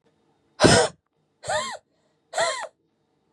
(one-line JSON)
{"exhalation_length": "3.3 s", "exhalation_amplitude": 31891, "exhalation_signal_mean_std_ratio": 0.35, "survey_phase": "beta (2021-08-13 to 2022-03-07)", "age": "18-44", "gender": "Female", "wearing_mask": "No", "symptom_cough_any": true, "symptom_new_continuous_cough": true, "symptom_runny_or_blocked_nose": true, "symptom_shortness_of_breath": true, "symptom_sore_throat": true, "symptom_abdominal_pain": true, "symptom_fatigue": true, "symptom_headache": true, "smoker_status": "Ex-smoker", "respiratory_condition_asthma": true, "respiratory_condition_other": false, "recruitment_source": "REACT", "submission_delay": "4 days", "covid_test_result": "Negative", "covid_test_method": "RT-qPCR", "influenza_a_test_result": "Negative", "influenza_b_test_result": "Negative"}